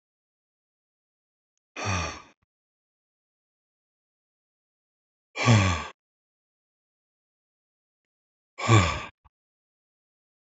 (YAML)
exhalation_length: 10.6 s
exhalation_amplitude: 17725
exhalation_signal_mean_std_ratio: 0.23
survey_phase: beta (2021-08-13 to 2022-03-07)
age: 18-44
gender: Male
wearing_mask: 'No'
symptom_cough_any: true
symptom_runny_or_blocked_nose: true
symptom_fatigue: true
smoker_status: Never smoked
respiratory_condition_asthma: false
respiratory_condition_other: false
recruitment_source: Test and Trace
submission_delay: 2 days
covid_test_result: Positive
covid_test_method: ePCR